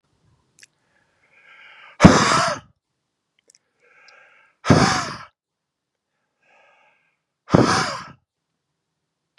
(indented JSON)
{
  "exhalation_length": "9.4 s",
  "exhalation_amplitude": 32768,
  "exhalation_signal_mean_std_ratio": 0.27,
  "survey_phase": "beta (2021-08-13 to 2022-03-07)",
  "age": "18-44",
  "gender": "Male",
  "wearing_mask": "No",
  "symptom_cough_any": true,
  "symptom_abdominal_pain": true,
  "symptom_fatigue": true,
  "symptom_headache": true,
  "symptom_change_to_sense_of_smell_or_taste": true,
  "symptom_loss_of_taste": true,
  "smoker_status": "Never smoked",
  "respiratory_condition_asthma": false,
  "respiratory_condition_other": false,
  "recruitment_source": "Test and Trace",
  "submission_delay": "1 day",
  "covid_test_result": "Positive",
  "covid_test_method": "RT-qPCR",
  "covid_ct_value": 35.4,
  "covid_ct_gene": "ORF1ab gene"
}